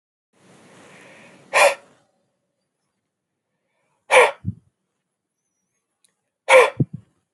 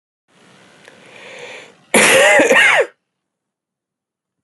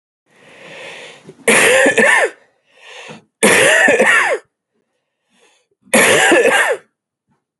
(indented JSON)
{
  "exhalation_length": "7.3 s",
  "exhalation_amplitude": 32767,
  "exhalation_signal_mean_std_ratio": 0.24,
  "cough_length": "4.4 s",
  "cough_amplitude": 32768,
  "cough_signal_mean_std_ratio": 0.41,
  "three_cough_length": "7.6 s",
  "three_cough_amplitude": 32768,
  "three_cough_signal_mean_std_ratio": 0.54,
  "survey_phase": "alpha (2021-03-01 to 2021-08-12)",
  "age": "18-44",
  "gender": "Male",
  "wearing_mask": "No",
  "symptom_none": true,
  "smoker_status": "Never smoked",
  "respiratory_condition_asthma": false,
  "respiratory_condition_other": false,
  "recruitment_source": "REACT",
  "submission_delay": "1 day",
  "covid_test_result": "Negative",
  "covid_test_method": "RT-qPCR"
}